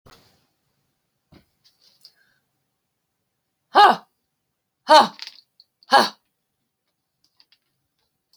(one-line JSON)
{"exhalation_length": "8.4 s", "exhalation_amplitude": 31148, "exhalation_signal_mean_std_ratio": 0.2, "survey_phase": "beta (2021-08-13 to 2022-03-07)", "age": "65+", "gender": "Female", "wearing_mask": "No", "symptom_none": true, "smoker_status": "Never smoked", "respiratory_condition_asthma": false, "respiratory_condition_other": false, "recruitment_source": "REACT", "submission_delay": "2 days", "covid_test_result": "Negative", "covid_test_method": "RT-qPCR"}